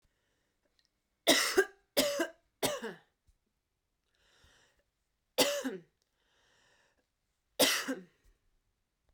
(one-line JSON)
{"three_cough_length": "9.1 s", "three_cough_amplitude": 10253, "three_cough_signal_mean_std_ratio": 0.31, "survey_phase": "beta (2021-08-13 to 2022-03-07)", "age": "18-44", "gender": "Female", "wearing_mask": "No", "symptom_fatigue": true, "symptom_headache": true, "symptom_change_to_sense_of_smell_or_taste": true, "smoker_status": "Never smoked", "respiratory_condition_asthma": false, "respiratory_condition_other": false, "recruitment_source": "Test and Trace", "submission_delay": "1 day", "covid_test_result": "Positive", "covid_test_method": "RT-qPCR", "covid_ct_value": 16.0, "covid_ct_gene": "ORF1ab gene", "covid_ct_mean": 16.7, "covid_viral_load": "3300000 copies/ml", "covid_viral_load_category": "High viral load (>1M copies/ml)"}